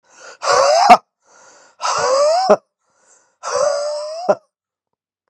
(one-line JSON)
{"exhalation_length": "5.3 s", "exhalation_amplitude": 32768, "exhalation_signal_mean_std_ratio": 0.49, "survey_phase": "beta (2021-08-13 to 2022-03-07)", "age": "18-44", "gender": "Male", "wearing_mask": "No", "symptom_cough_any": true, "symptom_runny_or_blocked_nose": true, "symptom_sore_throat": true, "symptom_fatigue": true, "symptom_onset": "5 days", "smoker_status": "Never smoked", "respiratory_condition_asthma": false, "respiratory_condition_other": false, "recruitment_source": "Test and Trace", "submission_delay": "2 days", "covid_test_result": "Positive", "covid_test_method": "RT-qPCR"}